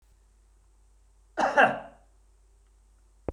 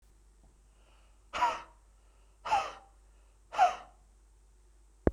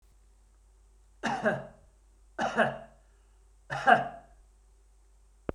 {"cough_length": "3.3 s", "cough_amplitude": 15951, "cough_signal_mean_std_ratio": 0.27, "exhalation_length": "5.1 s", "exhalation_amplitude": 14537, "exhalation_signal_mean_std_ratio": 0.31, "three_cough_length": "5.5 s", "three_cough_amplitude": 16387, "three_cough_signal_mean_std_ratio": 0.33, "survey_phase": "beta (2021-08-13 to 2022-03-07)", "age": "45-64", "gender": "Male", "wearing_mask": "No", "symptom_none": true, "smoker_status": "Ex-smoker", "respiratory_condition_asthma": false, "respiratory_condition_other": false, "recruitment_source": "REACT", "submission_delay": "0 days", "covid_test_result": "Negative", "covid_test_method": "RT-qPCR", "influenza_a_test_result": "Negative", "influenza_b_test_result": "Negative"}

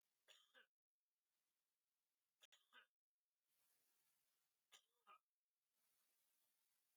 {"three_cough_length": "7.0 s", "three_cough_amplitude": 61, "three_cough_signal_mean_std_ratio": 0.34, "survey_phase": "beta (2021-08-13 to 2022-03-07)", "age": "65+", "gender": "Male", "wearing_mask": "No", "symptom_cough_any": true, "symptom_sore_throat": true, "smoker_status": "Never smoked", "respiratory_condition_asthma": false, "respiratory_condition_other": false, "recruitment_source": "Test and Trace", "submission_delay": "2 days", "covid_test_result": "Positive", "covid_test_method": "RT-qPCR", "covid_ct_value": 28.4, "covid_ct_gene": "ORF1ab gene", "covid_ct_mean": 28.9, "covid_viral_load": "330 copies/ml", "covid_viral_load_category": "Minimal viral load (< 10K copies/ml)"}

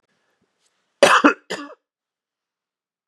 {"cough_length": "3.1 s", "cough_amplitude": 32767, "cough_signal_mean_std_ratio": 0.25, "survey_phase": "beta (2021-08-13 to 2022-03-07)", "age": "45-64", "gender": "Male", "wearing_mask": "No", "symptom_cough_any": true, "symptom_runny_or_blocked_nose": true, "smoker_status": "Never smoked", "respiratory_condition_asthma": false, "respiratory_condition_other": false, "recruitment_source": "Test and Trace", "submission_delay": "2 days", "covid_test_result": "Positive", "covid_test_method": "LFT"}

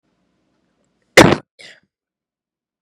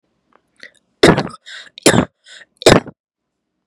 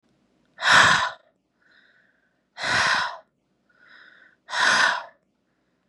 {"cough_length": "2.8 s", "cough_amplitude": 32768, "cough_signal_mean_std_ratio": 0.19, "three_cough_length": "3.7 s", "three_cough_amplitude": 32768, "three_cough_signal_mean_std_ratio": 0.29, "exhalation_length": "5.9 s", "exhalation_amplitude": 23594, "exhalation_signal_mean_std_ratio": 0.4, "survey_phase": "beta (2021-08-13 to 2022-03-07)", "age": "18-44", "gender": "Female", "wearing_mask": "No", "symptom_cough_any": true, "symptom_new_continuous_cough": true, "symptom_runny_or_blocked_nose": true, "symptom_shortness_of_breath": true, "symptom_diarrhoea": true, "symptom_fatigue": true, "symptom_fever_high_temperature": true, "symptom_headache": true, "symptom_onset": "5 days", "smoker_status": "Never smoked", "respiratory_condition_asthma": false, "respiratory_condition_other": false, "recruitment_source": "Test and Trace", "submission_delay": "2 days", "covid_test_result": "Positive", "covid_test_method": "RT-qPCR", "covid_ct_value": 19.2, "covid_ct_gene": "ORF1ab gene", "covid_ct_mean": 19.5, "covid_viral_load": "390000 copies/ml", "covid_viral_load_category": "Low viral load (10K-1M copies/ml)"}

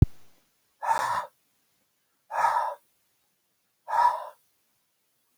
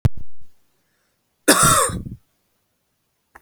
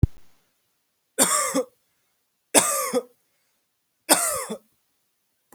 {"exhalation_length": "5.4 s", "exhalation_amplitude": 18973, "exhalation_signal_mean_std_ratio": 0.35, "cough_length": "3.4 s", "cough_amplitude": 32767, "cough_signal_mean_std_ratio": 0.44, "three_cough_length": "5.5 s", "three_cough_amplitude": 32039, "three_cough_signal_mean_std_ratio": 0.36, "survey_phase": "beta (2021-08-13 to 2022-03-07)", "age": "18-44", "gender": "Male", "wearing_mask": "No", "symptom_none": true, "smoker_status": "Never smoked", "respiratory_condition_asthma": false, "respiratory_condition_other": false, "recruitment_source": "REACT", "submission_delay": "2 days", "covid_test_result": "Negative", "covid_test_method": "RT-qPCR", "influenza_a_test_result": "Negative", "influenza_b_test_result": "Negative"}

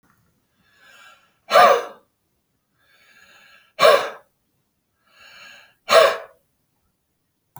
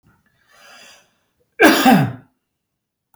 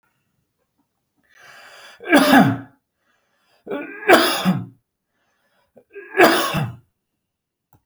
{"exhalation_length": "7.6 s", "exhalation_amplitude": 28839, "exhalation_signal_mean_std_ratio": 0.27, "cough_length": "3.2 s", "cough_amplitude": 31129, "cough_signal_mean_std_ratio": 0.33, "three_cough_length": "7.9 s", "three_cough_amplitude": 31884, "three_cough_signal_mean_std_ratio": 0.35, "survey_phase": "beta (2021-08-13 to 2022-03-07)", "age": "45-64", "gender": "Male", "wearing_mask": "No", "symptom_cough_any": true, "symptom_sore_throat": true, "symptom_headache": true, "symptom_onset": "13 days", "smoker_status": "Never smoked", "respiratory_condition_asthma": true, "respiratory_condition_other": false, "recruitment_source": "REACT", "submission_delay": "1 day", "covid_test_result": "Negative", "covid_test_method": "RT-qPCR"}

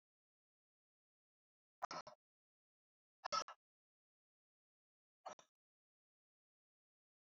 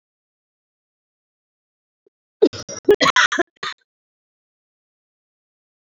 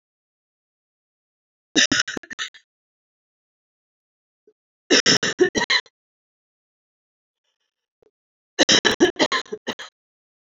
{"exhalation_length": "7.3 s", "exhalation_amplitude": 1398, "exhalation_signal_mean_std_ratio": 0.16, "cough_length": "5.8 s", "cough_amplitude": 26404, "cough_signal_mean_std_ratio": 0.23, "three_cough_length": "10.6 s", "three_cough_amplitude": 27759, "three_cough_signal_mean_std_ratio": 0.29, "survey_phase": "beta (2021-08-13 to 2022-03-07)", "age": "18-44", "gender": "Female", "wearing_mask": "No", "symptom_cough_any": true, "symptom_shortness_of_breath": true, "symptom_fatigue": true, "smoker_status": "Never smoked", "respiratory_condition_asthma": true, "respiratory_condition_other": false, "recruitment_source": "Test and Trace", "submission_delay": "2 days", "covid_test_result": "Positive", "covid_test_method": "RT-qPCR"}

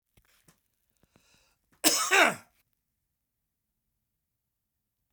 {"cough_length": "5.1 s", "cough_amplitude": 17189, "cough_signal_mean_std_ratio": 0.23, "survey_phase": "beta (2021-08-13 to 2022-03-07)", "age": "65+", "gender": "Male", "wearing_mask": "No", "symptom_none": true, "smoker_status": "Never smoked", "respiratory_condition_asthma": false, "respiratory_condition_other": false, "recruitment_source": "REACT", "submission_delay": "3 days", "covid_test_result": "Negative", "covid_test_method": "RT-qPCR", "influenza_a_test_result": "Negative", "influenza_b_test_result": "Negative"}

